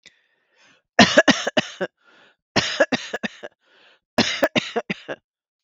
{
  "three_cough_length": "5.6 s",
  "three_cough_amplitude": 32768,
  "three_cough_signal_mean_std_ratio": 0.34,
  "survey_phase": "beta (2021-08-13 to 2022-03-07)",
  "age": "45-64",
  "gender": "Female",
  "wearing_mask": "No",
  "symptom_none": true,
  "smoker_status": "Never smoked",
  "respiratory_condition_asthma": false,
  "respiratory_condition_other": false,
  "recruitment_source": "REACT",
  "submission_delay": "1 day",
  "covid_test_result": "Negative",
  "covid_test_method": "RT-qPCR"
}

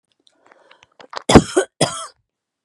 {
  "cough_length": "2.6 s",
  "cough_amplitude": 32768,
  "cough_signal_mean_std_ratio": 0.26,
  "survey_phase": "beta (2021-08-13 to 2022-03-07)",
  "age": "45-64",
  "gender": "Female",
  "wearing_mask": "No",
  "symptom_runny_or_blocked_nose": true,
  "symptom_shortness_of_breath": true,
  "symptom_change_to_sense_of_smell_or_taste": true,
  "smoker_status": "Ex-smoker",
  "respiratory_condition_asthma": false,
  "respiratory_condition_other": false,
  "recruitment_source": "REACT",
  "submission_delay": "2 days",
  "covid_test_result": "Negative",
  "covid_test_method": "RT-qPCR",
  "influenza_a_test_result": "Negative",
  "influenza_b_test_result": "Negative"
}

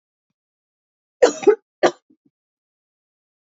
{
  "cough_length": "3.5 s",
  "cough_amplitude": 27865,
  "cough_signal_mean_std_ratio": 0.21,
  "survey_phase": "beta (2021-08-13 to 2022-03-07)",
  "age": "45-64",
  "gender": "Female",
  "wearing_mask": "No",
  "symptom_cough_any": true,
  "symptom_runny_or_blocked_nose": true,
  "symptom_fever_high_temperature": true,
  "symptom_other": true,
  "symptom_onset": "3 days",
  "smoker_status": "Never smoked",
  "respiratory_condition_asthma": false,
  "respiratory_condition_other": false,
  "recruitment_source": "Test and Trace",
  "submission_delay": "1 day",
  "covid_test_result": "Positive",
  "covid_test_method": "ePCR"
}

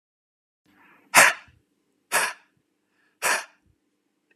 {
  "exhalation_length": "4.4 s",
  "exhalation_amplitude": 31175,
  "exhalation_signal_mean_std_ratio": 0.25,
  "survey_phase": "beta (2021-08-13 to 2022-03-07)",
  "age": "18-44",
  "gender": "Female",
  "wearing_mask": "No",
  "symptom_cough_any": true,
  "symptom_sore_throat": true,
  "symptom_fatigue": true,
  "symptom_onset": "10 days",
  "smoker_status": "Ex-smoker",
  "respiratory_condition_asthma": false,
  "respiratory_condition_other": false,
  "recruitment_source": "REACT",
  "submission_delay": "2 days",
  "covid_test_result": "Negative",
  "covid_test_method": "RT-qPCR",
  "influenza_a_test_result": "Negative",
  "influenza_b_test_result": "Negative"
}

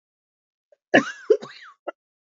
{
  "cough_length": "2.3 s",
  "cough_amplitude": 27276,
  "cough_signal_mean_std_ratio": 0.24,
  "survey_phase": "beta (2021-08-13 to 2022-03-07)",
  "age": "45-64",
  "gender": "Female",
  "wearing_mask": "No",
  "symptom_new_continuous_cough": true,
  "symptom_runny_or_blocked_nose": true,
  "symptom_shortness_of_breath": true,
  "symptom_sore_throat": true,
  "symptom_fatigue": true,
  "symptom_headache": true,
  "smoker_status": "Never smoked",
  "respiratory_condition_asthma": false,
  "respiratory_condition_other": false,
  "recruitment_source": "Test and Trace",
  "submission_delay": "0 days",
  "covid_test_result": "Positive",
  "covid_test_method": "RT-qPCR",
  "covid_ct_value": 22.6,
  "covid_ct_gene": "N gene"
}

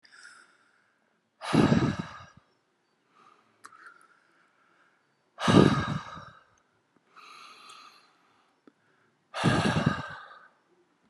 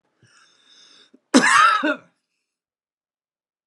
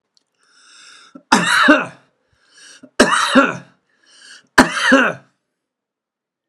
{
  "exhalation_length": "11.1 s",
  "exhalation_amplitude": 18731,
  "exhalation_signal_mean_std_ratio": 0.31,
  "cough_length": "3.7 s",
  "cough_amplitude": 30090,
  "cough_signal_mean_std_ratio": 0.32,
  "three_cough_length": "6.5 s",
  "three_cough_amplitude": 32768,
  "three_cough_signal_mean_std_ratio": 0.38,
  "survey_phase": "alpha (2021-03-01 to 2021-08-12)",
  "age": "45-64",
  "gender": "Male",
  "wearing_mask": "No",
  "symptom_none": true,
  "smoker_status": "Never smoked",
  "respiratory_condition_asthma": false,
  "respiratory_condition_other": false,
  "recruitment_source": "REACT",
  "submission_delay": "8 days",
  "covid_test_result": "Negative",
  "covid_test_method": "RT-qPCR"
}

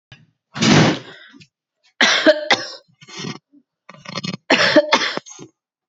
{
  "cough_length": "5.9 s",
  "cough_amplitude": 29990,
  "cough_signal_mean_std_ratio": 0.43,
  "survey_phase": "beta (2021-08-13 to 2022-03-07)",
  "age": "18-44",
  "gender": "Female",
  "wearing_mask": "Yes",
  "symptom_runny_or_blocked_nose": true,
  "symptom_fatigue": true,
  "symptom_headache": true,
  "symptom_change_to_sense_of_smell_or_taste": true,
  "symptom_loss_of_taste": true,
  "symptom_onset": "10 days",
  "smoker_status": "Ex-smoker",
  "respiratory_condition_asthma": false,
  "respiratory_condition_other": false,
  "recruitment_source": "Test and Trace",
  "submission_delay": "2 days",
  "covid_test_result": "Positive",
  "covid_test_method": "ePCR"
}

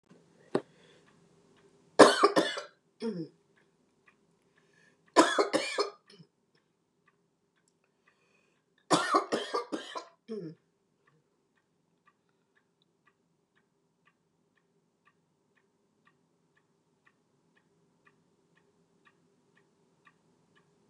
{
  "three_cough_length": "20.9 s",
  "three_cough_amplitude": 25140,
  "three_cough_signal_mean_std_ratio": 0.21,
  "survey_phase": "beta (2021-08-13 to 2022-03-07)",
  "age": "65+",
  "gender": "Female",
  "wearing_mask": "No",
  "symptom_none": true,
  "smoker_status": "Never smoked",
  "respiratory_condition_asthma": false,
  "respiratory_condition_other": false,
  "recruitment_source": "REACT",
  "submission_delay": "2 days",
  "covid_test_result": "Negative",
  "covid_test_method": "RT-qPCR",
  "influenza_a_test_result": "Negative",
  "influenza_b_test_result": "Negative"
}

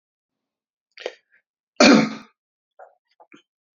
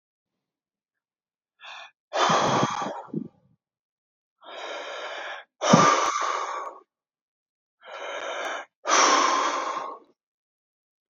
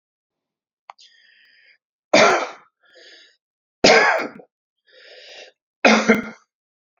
{
  "cough_length": "3.8 s",
  "cough_amplitude": 28490,
  "cough_signal_mean_std_ratio": 0.23,
  "exhalation_length": "11.1 s",
  "exhalation_amplitude": 26237,
  "exhalation_signal_mean_std_ratio": 0.46,
  "three_cough_length": "7.0 s",
  "three_cough_amplitude": 31191,
  "three_cough_signal_mean_std_ratio": 0.32,
  "survey_phase": "beta (2021-08-13 to 2022-03-07)",
  "age": "45-64",
  "gender": "Male",
  "wearing_mask": "No",
  "symptom_cough_any": true,
  "symptom_onset": "12 days",
  "smoker_status": "Never smoked",
  "respiratory_condition_asthma": false,
  "respiratory_condition_other": false,
  "recruitment_source": "REACT",
  "submission_delay": "1 day",
  "covid_test_result": "Negative",
  "covid_test_method": "RT-qPCR",
  "influenza_a_test_result": "Negative",
  "influenza_b_test_result": "Negative"
}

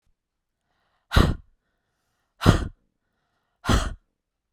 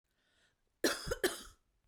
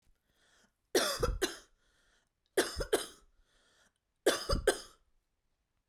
{
  "exhalation_length": "4.5 s",
  "exhalation_amplitude": 32724,
  "exhalation_signal_mean_std_ratio": 0.28,
  "cough_length": "1.9 s",
  "cough_amplitude": 3956,
  "cough_signal_mean_std_ratio": 0.35,
  "three_cough_length": "5.9 s",
  "three_cough_amplitude": 7006,
  "three_cough_signal_mean_std_ratio": 0.35,
  "survey_phase": "beta (2021-08-13 to 2022-03-07)",
  "age": "18-44",
  "gender": "Female",
  "wearing_mask": "No",
  "symptom_cough_any": true,
  "symptom_onset": "3 days",
  "smoker_status": "Never smoked",
  "respiratory_condition_asthma": true,
  "respiratory_condition_other": false,
  "recruitment_source": "REACT",
  "submission_delay": "2 days",
  "covid_test_result": "Negative",
  "covid_test_method": "RT-qPCR"
}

